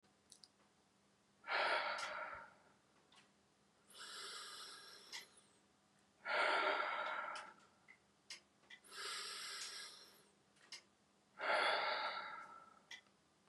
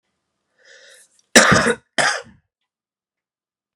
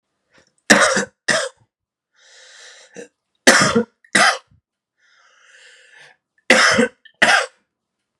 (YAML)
exhalation_length: 13.5 s
exhalation_amplitude: 2080
exhalation_signal_mean_std_ratio: 0.49
cough_length: 3.8 s
cough_amplitude: 32768
cough_signal_mean_std_ratio: 0.29
three_cough_length: 8.2 s
three_cough_amplitude: 32768
three_cough_signal_mean_std_ratio: 0.36
survey_phase: beta (2021-08-13 to 2022-03-07)
age: 18-44
gender: Male
wearing_mask: 'No'
symptom_none: true
smoker_status: Never smoked
respiratory_condition_asthma: false
respiratory_condition_other: false
recruitment_source: REACT
submission_delay: 4 days
covid_test_result: Negative
covid_test_method: RT-qPCR
influenza_a_test_result: Negative
influenza_b_test_result: Negative